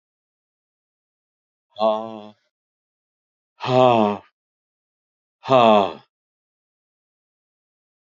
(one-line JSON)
{"exhalation_length": "8.2 s", "exhalation_amplitude": 27661, "exhalation_signal_mean_std_ratio": 0.27, "survey_phase": "beta (2021-08-13 to 2022-03-07)", "age": "65+", "gender": "Male", "wearing_mask": "No", "symptom_none": true, "smoker_status": "Current smoker (1 to 10 cigarettes per day)", "respiratory_condition_asthma": false, "respiratory_condition_other": false, "recruitment_source": "REACT", "submission_delay": "5 days", "covid_test_result": "Negative", "covid_test_method": "RT-qPCR", "influenza_a_test_result": "Negative", "influenza_b_test_result": "Negative"}